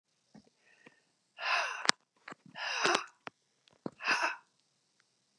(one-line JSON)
{"exhalation_length": "5.4 s", "exhalation_amplitude": 27903, "exhalation_signal_mean_std_ratio": 0.35, "survey_phase": "beta (2021-08-13 to 2022-03-07)", "age": "45-64", "gender": "Female", "wearing_mask": "No", "symptom_cough_any": true, "symptom_sore_throat": true, "symptom_fatigue": true, "symptom_headache": true, "smoker_status": "Never smoked", "respiratory_condition_asthma": false, "respiratory_condition_other": false, "recruitment_source": "Test and Trace", "submission_delay": "2 days", "covid_test_result": "Negative", "covid_test_method": "RT-qPCR"}